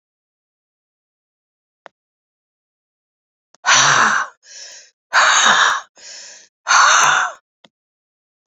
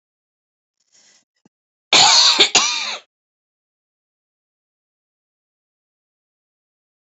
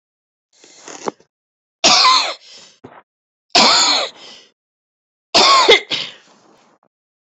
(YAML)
exhalation_length: 8.5 s
exhalation_amplitude: 31260
exhalation_signal_mean_std_ratio: 0.4
cough_length: 7.1 s
cough_amplitude: 32428
cough_signal_mean_std_ratio: 0.27
three_cough_length: 7.3 s
three_cough_amplitude: 31627
three_cough_signal_mean_std_ratio: 0.4
survey_phase: beta (2021-08-13 to 2022-03-07)
age: 65+
gender: Female
wearing_mask: 'No'
symptom_cough_any: true
symptom_shortness_of_breath: true
smoker_status: Ex-smoker
respiratory_condition_asthma: true
respiratory_condition_other: false
recruitment_source: REACT
submission_delay: 1 day
covid_test_result: Negative
covid_test_method: RT-qPCR
influenza_a_test_result: Negative
influenza_b_test_result: Negative